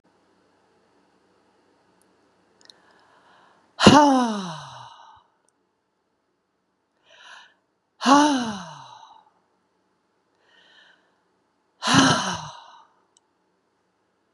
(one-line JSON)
{"exhalation_length": "14.3 s", "exhalation_amplitude": 32768, "exhalation_signal_mean_std_ratio": 0.26, "survey_phase": "beta (2021-08-13 to 2022-03-07)", "age": "45-64", "gender": "Female", "wearing_mask": "No", "symptom_none": true, "symptom_onset": "11 days", "smoker_status": "Current smoker (1 to 10 cigarettes per day)", "respiratory_condition_asthma": false, "respiratory_condition_other": false, "recruitment_source": "REACT", "submission_delay": "1 day", "covid_test_result": "Negative", "covid_test_method": "RT-qPCR", "influenza_a_test_result": "Negative", "influenza_b_test_result": "Negative"}